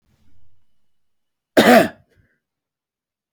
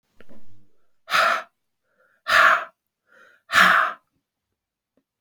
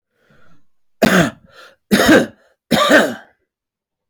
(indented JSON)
{
  "cough_length": "3.3 s",
  "cough_amplitude": 30052,
  "cough_signal_mean_std_ratio": 0.26,
  "exhalation_length": "5.2 s",
  "exhalation_amplitude": 26990,
  "exhalation_signal_mean_std_ratio": 0.39,
  "three_cough_length": "4.1 s",
  "three_cough_amplitude": 31682,
  "three_cough_signal_mean_std_ratio": 0.42,
  "survey_phase": "beta (2021-08-13 to 2022-03-07)",
  "age": "45-64",
  "gender": "Male",
  "wearing_mask": "No",
  "symptom_cough_any": true,
  "symptom_shortness_of_breath": true,
  "symptom_sore_throat": true,
  "symptom_fatigue": true,
  "symptom_headache": true,
  "symptom_change_to_sense_of_smell_or_taste": true,
  "smoker_status": "Never smoked",
  "respiratory_condition_asthma": false,
  "respiratory_condition_other": false,
  "recruitment_source": "Test and Trace",
  "submission_delay": "5 days",
  "covid_test_result": "Positive",
  "covid_test_method": "RT-qPCR"
}